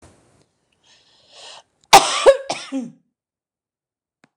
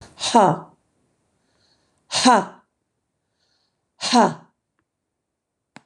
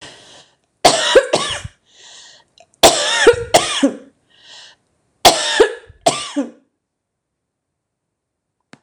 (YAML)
cough_length: 4.4 s
cough_amplitude: 26028
cough_signal_mean_std_ratio: 0.24
exhalation_length: 5.9 s
exhalation_amplitude: 26009
exhalation_signal_mean_std_ratio: 0.3
three_cough_length: 8.8 s
three_cough_amplitude: 26028
three_cough_signal_mean_std_ratio: 0.38
survey_phase: beta (2021-08-13 to 2022-03-07)
age: 65+
gender: Female
wearing_mask: 'No'
symptom_headache: true
smoker_status: Ex-smoker
respiratory_condition_asthma: false
respiratory_condition_other: false
recruitment_source: REACT
submission_delay: 2 days
covid_test_result: Negative
covid_test_method: RT-qPCR